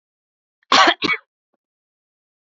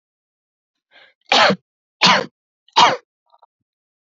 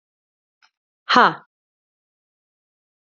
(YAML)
cough_length: 2.6 s
cough_amplitude: 29051
cough_signal_mean_std_ratio: 0.28
three_cough_length: 4.1 s
three_cough_amplitude: 29640
three_cough_signal_mean_std_ratio: 0.32
exhalation_length: 3.2 s
exhalation_amplitude: 32047
exhalation_signal_mean_std_ratio: 0.19
survey_phase: beta (2021-08-13 to 2022-03-07)
age: 18-44
gender: Female
wearing_mask: 'No'
symptom_none: true
smoker_status: Never smoked
respiratory_condition_asthma: false
respiratory_condition_other: false
recruitment_source: Test and Trace
submission_delay: 1 day
covid_test_result: Negative
covid_test_method: RT-qPCR